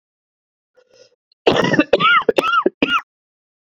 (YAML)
three_cough_length: 3.8 s
three_cough_amplitude: 30672
three_cough_signal_mean_std_ratio: 0.44
survey_phase: beta (2021-08-13 to 2022-03-07)
age: 18-44
gender: Male
wearing_mask: 'No'
symptom_cough_any: true
symptom_runny_or_blocked_nose: true
symptom_shortness_of_breath: true
symptom_sore_throat: true
symptom_diarrhoea: true
symptom_fatigue: true
symptom_fever_high_temperature: true
smoker_status: Ex-smoker
respiratory_condition_asthma: true
respiratory_condition_other: false
recruitment_source: Test and Trace
submission_delay: 2 days
covid_test_result: Positive
covid_test_method: RT-qPCR